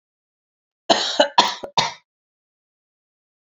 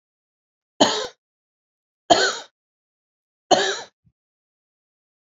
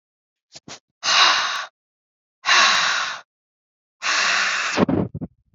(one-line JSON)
{"cough_length": "3.6 s", "cough_amplitude": 28602, "cough_signal_mean_std_ratio": 0.29, "three_cough_length": "5.2 s", "three_cough_amplitude": 28381, "three_cough_signal_mean_std_ratio": 0.27, "exhalation_length": "5.5 s", "exhalation_amplitude": 25466, "exhalation_signal_mean_std_ratio": 0.54, "survey_phase": "beta (2021-08-13 to 2022-03-07)", "age": "18-44", "gender": "Female", "wearing_mask": "No", "symptom_sore_throat": true, "symptom_fatigue": true, "smoker_status": "Never smoked", "respiratory_condition_asthma": false, "respiratory_condition_other": false, "recruitment_source": "Test and Trace", "submission_delay": "2 days", "covid_test_result": "Positive", "covid_test_method": "LFT"}